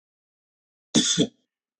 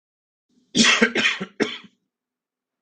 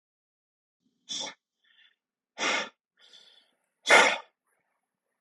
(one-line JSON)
{"cough_length": "1.8 s", "cough_amplitude": 16825, "cough_signal_mean_std_ratio": 0.32, "three_cough_length": "2.8 s", "three_cough_amplitude": 25365, "three_cough_signal_mean_std_ratio": 0.39, "exhalation_length": "5.2 s", "exhalation_amplitude": 18622, "exhalation_signal_mean_std_ratio": 0.25, "survey_phase": "beta (2021-08-13 to 2022-03-07)", "age": "18-44", "gender": "Male", "wearing_mask": "No", "symptom_runny_or_blocked_nose": true, "symptom_onset": "8 days", "smoker_status": "Ex-smoker", "respiratory_condition_asthma": true, "respiratory_condition_other": false, "recruitment_source": "REACT", "submission_delay": "0 days", "covid_test_result": "Negative", "covid_test_method": "RT-qPCR", "influenza_a_test_result": "Negative", "influenza_b_test_result": "Negative"}